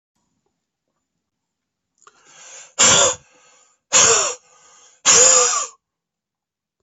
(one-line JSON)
{"exhalation_length": "6.8 s", "exhalation_amplitude": 32768, "exhalation_signal_mean_std_ratio": 0.36, "survey_phase": "beta (2021-08-13 to 2022-03-07)", "age": "18-44", "gender": "Female", "wearing_mask": "No", "symptom_cough_any": true, "symptom_runny_or_blocked_nose": true, "symptom_fatigue": true, "symptom_headache": true, "symptom_change_to_sense_of_smell_or_taste": true, "symptom_loss_of_taste": true, "symptom_onset": "4 days", "smoker_status": "Ex-smoker", "respiratory_condition_asthma": false, "respiratory_condition_other": false, "recruitment_source": "Test and Trace", "submission_delay": "3 days", "covid_test_result": "Positive", "covid_test_method": "RT-qPCR"}